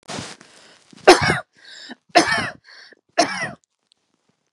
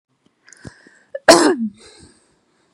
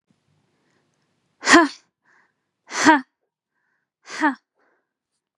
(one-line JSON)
{"three_cough_length": "4.5 s", "three_cough_amplitude": 32768, "three_cough_signal_mean_std_ratio": 0.32, "cough_length": "2.7 s", "cough_amplitude": 32768, "cough_signal_mean_std_ratio": 0.28, "exhalation_length": "5.4 s", "exhalation_amplitude": 32767, "exhalation_signal_mean_std_ratio": 0.25, "survey_phase": "beta (2021-08-13 to 2022-03-07)", "age": "18-44", "gender": "Female", "wearing_mask": "No", "symptom_runny_or_blocked_nose": true, "symptom_abdominal_pain": true, "symptom_headache": true, "smoker_status": "Never smoked", "respiratory_condition_asthma": false, "respiratory_condition_other": false, "recruitment_source": "REACT", "submission_delay": "1 day", "covid_test_result": "Negative", "covid_test_method": "RT-qPCR", "influenza_a_test_result": "Negative", "influenza_b_test_result": "Negative"}